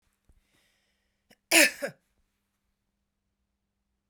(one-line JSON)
{"cough_length": "4.1 s", "cough_amplitude": 18093, "cough_signal_mean_std_ratio": 0.18, "survey_phase": "beta (2021-08-13 to 2022-03-07)", "age": "45-64", "gender": "Female", "wearing_mask": "No", "symptom_none": true, "smoker_status": "Never smoked", "respiratory_condition_asthma": false, "respiratory_condition_other": false, "recruitment_source": "REACT", "submission_delay": "9 days", "covid_test_result": "Negative", "covid_test_method": "RT-qPCR"}